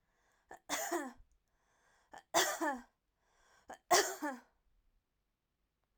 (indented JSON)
{
  "three_cough_length": "6.0 s",
  "three_cough_amplitude": 5757,
  "three_cough_signal_mean_std_ratio": 0.33,
  "survey_phase": "beta (2021-08-13 to 2022-03-07)",
  "age": "45-64",
  "gender": "Female",
  "wearing_mask": "No",
  "symptom_other": true,
  "smoker_status": "Never smoked",
  "respiratory_condition_asthma": false,
  "respiratory_condition_other": false,
  "recruitment_source": "Test and Trace",
  "submission_delay": "2 days",
  "covid_test_result": "Positive",
  "covid_test_method": "RT-qPCR",
  "covid_ct_value": 37.0,
  "covid_ct_gene": "N gene"
}